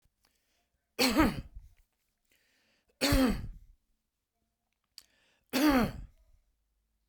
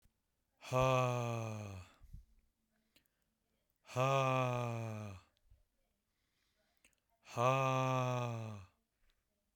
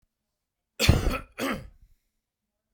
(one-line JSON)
{"three_cough_length": "7.1 s", "three_cough_amplitude": 9134, "three_cough_signal_mean_std_ratio": 0.35, "exhalation_length": "9.6 s", "exhalation_amplitude": 3519, "exhalation_signal_mean_std_ratio": 0.49, "cough_length": "2.7 s", "cough_amplitude": 19997, "cough_signal_mean_std_ratio": 0.33, "survey_phase": "beta (2021-08-13 to 2022-03-07)", "age": "45-64", "gender": "Male", "wearing_mask": "No", "symptom_none": true, "smoker_status": "Never smoked", "respiratory_condition_asthma": false, "respiratory_condition_other": false, "recruitment_source": "Test and Trace", "submission_delay": "50 days", "covid_test_result": "Negative", "covid_test_method": "LFT"}